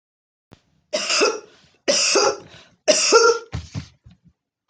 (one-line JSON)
{"three_cough_length": "4.7 s", "three_cough_amplitude": 28238, "three_cough_signal_mean_std_ratio": 0.47, "survey_phase": "beta (2021-08-13 to 2022-03-07)", "age": "45-64", "gender": "Female", "wearing_mask": "No", "symptom_none": true, "smoker_status": "Never smoked", "respiratory_condition_asthma": false, "respiratory_condition_other": false, "recruitment_source": "REACT", "submission_delay": "2 days", "covid_test_result": "Negative", "covid_test_method": "RT-qPCR"}